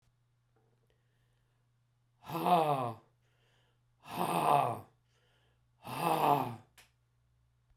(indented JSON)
{
  "exhalation_length": "7.8 s",
  "exhalation_amplitude": 6412,
  "exhalation_signal_mean_std_ratio": 0.38,
  "survey_phase": "beta (2021-08-13 to 2022-03-07)",
  "age": "45-64",
  "gender": "Male",
  "wearing_mask": "No",
  "symptom_cough_any": true,
  "symptom_fatigue": true,
  "symptom_headache": true,
  "smoker_status": "Never smoked",
  "respiratory_condition_asthma": false,
  "respiratory_condition_other": false,
  "recruitment_source": "Test and Trace",
  "submission_delay": "1 day",
  "covid_test_result": "Positive",
  "covid_test_method": "RT-qPCR",
  "covid_ct_value": 17.5,
  "covid_ct_gene": "ORF1ab gene",
  "covid_ct_mean": 18.0,
  "covid_viral_load": "1200000 copies/ml",
  "covid_viral_load_category": "High viral load (>1M copies/ml)"
}